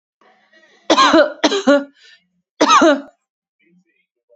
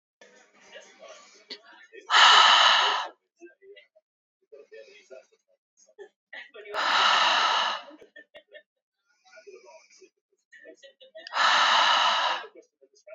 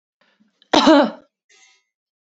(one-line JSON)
{"three_cough_length": "4.4 s", "three_cough_amplitude": 30830, "three_cough_signal_mean_std_ratio": 0.42, "exhalation_length": "13.1 s", "exhalation_amplitude": 20402, "exhalation_signal_mean_std_ratio": 0.41, "cough_length": "2.2 s", "cough_amplitude": 28651, "cough_signal_mean_std_ratio": 0.32, "survey_phase": "beta (2021-08-13 to 2022-03-07)", "age": "18-44", "gender": "Female", "wearing_mask": "No", "symptom_none": true, "smoker_status": "Never smoked", "respiratory_condition_asthma": true, "respiratory_condition_other": false, "recruitment_source": "REACT", "submission_delay": "12 days", "covid_test_result": "Negative", "covid_test_method": "RT-qPCR", "influenza_a_test_result": "Negative", "influenza_b_test_result": "Negative"}